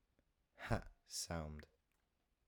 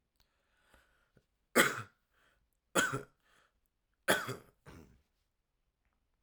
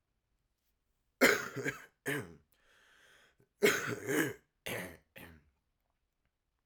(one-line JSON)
{"exhalation_length": "2.5 s", "exhalation_amplitude": 1639, "exhalation_signal_mean_std_ratio": 0.4, "three_cough_length": "6.2 s", "three_cough_amplitude": 8588, "three_cough_signal_mean_std_ratio": 0.25, "cough_length": "6.7 s", "cough_amplitude": 9979, "cough_signal_mean_std_ratio": 0.33, "survey_phase": "alpha (2021-03-01 to 2021-08-12)", "age": "18-44", "gender": "Male", "wearing_mask": "No", "symptom_cough_any": true, "symptom_fever_high_temperature": true, "symptom_headache": true, "smoker_status": "Never smoked", "respiratory_condition_asthma": false, "respiratory_condition_other": false, "recruitment_source": "Test and Trace", "submission_delay": "2 days", "covid_test_result": "Positive", "covid_test_method": "RT-qPCR", "covid_ct_value": 11.3, "covid_ct_gene": "ORF1ab gene", "covid_ct_mean": 11.8, "covid_viral_load": "140000000 copies/ml", "covid_viral_load_category": "High viral load (>1M copies/ml)"}